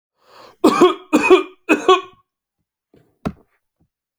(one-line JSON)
{"three_cough_length": "4.2 s", "three_cough_amplitude": 32768, "three_cough_signal_mean_std_ratio": 0.36, "survey_phase": "alpha (2021-03-01 to 2021-08-12)", "age": "18-44", "gender": "Male", "wearing_mask": "No", "symptom_none": true, "smoker_status": "Ex-smoker", "respiratory_condition_asthma": false, "respiratory_condition_other": false, "recruitment_source": "REACT", "submission_delay": "2 days", "covid_test_result": "Negative", "covid_test_method": "RT-qPCR"}